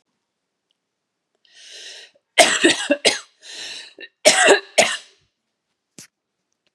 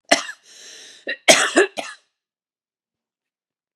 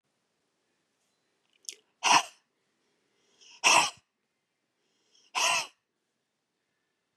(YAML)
three_cough_length: 6.7 s
three_cough_amplitude: 32768
three_cough_signal_mean_std_ratio: 0.32
cough_length: 3.8 s
cough_amplitude: 32768
cough_signal_mean_std_ratio: 0.28
exhalation_length: 7.2 s
exhalation_amplitude: 13034
exhalation_signal_mean_std_ratio: 0.25
survey_phase: beta (2021-08-13 to 2022-03-07)
age: 45-64
gender: Female
wearing_mask: 'No'
symptom_cough_any: true
symptom_runny_or_blocked_nose: true
symptom_sore_throat: true
symptom_fatigue: true
symptom_fever_high_temperature: true
symptom_headache: true
symptom_other: true
smoker_status: Never smoked
respiratory_condition_asthma: true
respiratory_condition_other: false
recruitment_source: Test and Trace
submission_delay: 1 day
covid_test_result: Positive
covid_test_method: RT-qPCR
covid_ct_value: 22.5
covid_ct_gene: ORF1ab gene
covid_ct_mean: 23.1
covid_viral_load: 27000 copies/ml
covid_viral_load_category: Low viral load (10K-1M copies/ml)